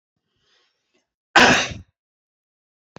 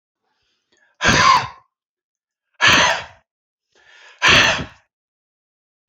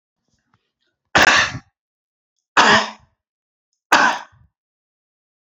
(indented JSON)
{
  "cough_length": "3.0 s",
  "cough_amplitude": 29102,
  "cough_signal_mean_std_ratio": 0.25,
  "exhalation_length": "5.9 s",
  "exhalation_amplitude": 31520,
  "exhalation_signal_mean_std_ratio": 0.37,
  "three_cough_length": "5.5 s",
  "three_cough_amplitude": 28522,
  "three_cough_signal_mean_std_ratio": 0.32,
  "survey_phase": "beta (2021-08-13 to 2022-03-07)",
  "age": "65+",
  "gender": "Male",
  "wearing_mask": "No",
  "symptom_none": true,
  "smoker_status": "Never smoked",
  "respiratory_condition_asthma": false,
  "respiratory_condition_other": false,
  "recruitment_source": "REACT",
  "submission_delay": "1 day",
  "covid_test_result": "Negative",
  "covid_test_method": "RT-qPCR",
  "influenza_a_test_result": "Negative",
  "influenza_b_test_result": "Negative"
}